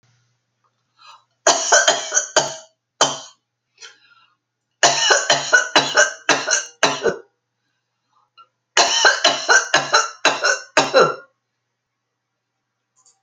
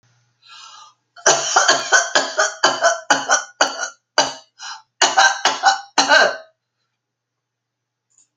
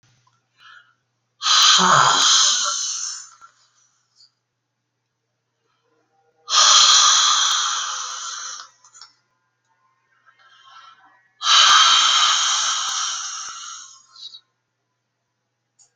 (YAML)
three_cough_length: 13.2 s
three_cough_amplitude: 32768
three_cough_signal_mean_std_ratio: 0.44
cough_length: 8.4 s
cough_amplitude: 32768
cough_signal_mean_std_ratio: 0.47
exhalation_length: 16.0 s
exhalation_amplitude: 30217
exhalation_signal_mean_std_ratio: 0.47
survey_phase: alpha (2021-03-01 to 2021-08-12)
age: 65+
gender: Female
wearing_mask: 'No'
symptom_fatigue: true
symptom_onset: 12 days
smoker_status: Ex-smoker
respiratory_condition_asthma: false
respiratory_condition_other: false
recruitment_source: REACT
submission_delay: 1 day
covid_test_result: Negative
covid_test_method: RT-qPCR